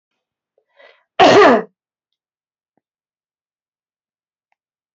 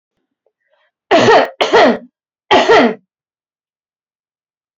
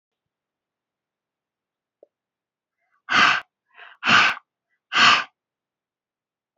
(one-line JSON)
{"cough_length": "4.9 s", "cough_amplitude": 30190, "cough_signal_mean_std_ratio": 0.24, "three_cough_length": "4.8 s", "three_cough_amplitude": 29586, "three_cough_signal_mean_std_ratio": 0.41, "exhalation_length": "6.6 s", "exhalation_amplitude": 25478, "exhalation_signal_mean_std_ratio": 0.29, "survey_phase": "alpha (2021-03-01 to 2021-08-12)", "age": "18-44", "gender": "Female", "wearing_mask": "No", "symptom_shortness_of_breath": true, "symptom_fatigue": true, "symptom_change_to_sense_of_smell_or_taste": true, "symptom_onset": "3 days", "smoker_status": "Ex-smoker", "respiratory_condition_asthma": false, "respiratory_condition_other": false, "recruitment_source": "Test and Trace", "submission_delay": "2 days", "covid_test_result": "Positive", "covid_test_method": "RT-qPCR", "covid_ct_value": 17.6, "covid_ct_gene": "ORF1ab gene", "covid_ct_mean": 17.8, "covid_viral_load": "1500000 copies/ml", "covid_viral_load_category": "High viral load (>1M copies/ml)"}